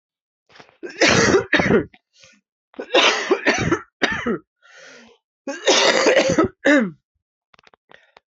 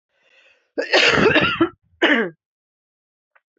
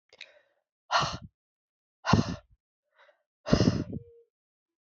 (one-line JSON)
{"three_cough_length": "8.3 s", "three_cough_amplitude": 27902, "three_cough_signal_mean_std_ratio": 0.5, "cough_length": "3.6 s", "cough_amplitude": 26453, "cough_signal_mean_std_ratio": 0.45, "exhalation_length": "4.9 s", "exhalation_amplitude": 16018, "exhalation_signal_mean_std_ratio": 0.31, "survey_phase": "alpha (2021-03-01 to 2021-08-12)", "age": "45-64", "gender": "Female", "wearing_mask": "No", "symptom_cough_any": true, "symptom_shortness_of_breath": true, "symptom_fatigue": true, "symptom_headache": true, "symptom_onset": "3 days", "smoker_status": "Ex-smoker", "respiratory_condition_asthma": false, "respiratory_condition_other": false, "recruitment_source": "Test and Trace", "submission_delay": "2 days", "covid_test_result": "Positive", "covid_test_method": "RT-qPCR", "covid_ct_value": 15.9, "covid_ct_gene": "ORF1ab gene", "covid_ct_mean": 17.0, "covid_viral_load": "2600000 copies/ml", "covid_viral_load_category": "High viral load (>1M copies/ml)"}